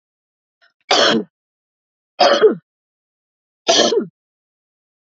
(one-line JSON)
{"three_cough_length": "5.0 s", "three_cough_amplitude": 30289, "three_cough_signal_mean_std_ratio": 0.36, "survey_phase": "beta (2021-08-13 to 2022-03-07)", "age": "45-64", "gender": "Female", "wearing_mask": "No", "symptom_cough_any": true, "symptom_runny_or_blocked_nose": true, "symptom_sore_throat": true, "symptom_headache": true, "symptom_other": true, "symptom_onset": "2 days", "smoker_status": "Never smoked", "respiratory_condition_asthma": false, "respiratory_condition_other": false, "recruitment_source": "Test and Trace", "submission_delay": "1 day", "covid_test_result": "Positive", "covid_test_method": "RT-qPCR", "covid_ct_value": 28.3, "covid_ct_gene": "ORF1ab gene", "covid_ct_mean": 29.2, "covid_viral_load": "260 copies/ml", "covid_viral_load_category": "Minimal viral load (< 10K copies/ml)"}